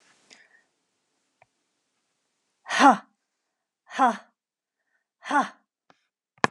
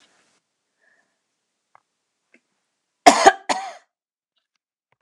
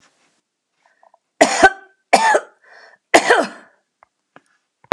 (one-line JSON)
{"exhalation_length": "6.5 s", "exhalation_amplitude": 28095, "exhalation_signal_mean_std_ratio": 0.22, "cough_length": "5.0 s", "cough_amplitude": 32768, "cough_signal_mean_std_ratio": 0.18, "three_cough_length": "4.9 s", "three_cough_amplitude": 32768, "three_cough_signal_mean_std_ratio": 0.31, "survey_phase": "beta (2021-08-13 to 2022-03-07)", "age": "65+", "gender": "Female", "wearing_mask": "No", "symptom_none": true, "smoker_status": "Never smoked", "respiratory_condition_asthma": false, "respiratory_condition_other": false, "recruitment_source": "REACT", "submission_delay": "8 days", "covid_test_result": "Negative", "covid_test_method": "RT-qPCR", "influenza_a_test_result": "Negative", "influenza_b_test_result": "Negative"}